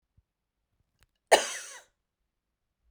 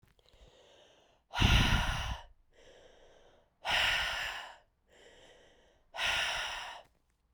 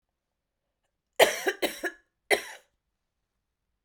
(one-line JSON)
{"cough_length": "2.9 s", "cough_amplitude": 20476, "cough_signal_mean_std_ratio": 0.17, "exhalation_length": "7.3 s", "exhalation_amplitude": 7109, "exhalation_signal_mean_std_ratio": 0.45, "three_cough_length": "3.8 s", "three_cough_amplitude": 22455, "three_cough_signal_mean_std_ratio": 0.25, "survey_phase": "beta (2021-08-13 to 2022-03-07)", "age": "18-44", "gender": "Female", "wearing_mask": "No", "symptom_cough_any": true, "symptom_new_continuous_cough": true, "symptom_runny_or_blocked_nose": true, "symptom_loss_of_taste": true, "symptom_onset": "4 days", "smoker_status": "Never smoked", "respiratory_condition_asthma": false, "respiratory_condition_other": false, "recruitment_source": "Test and Trace", "submission_delay": "2 days", "covid_test_result": "Positive", "covid_test_method": "ePCR"}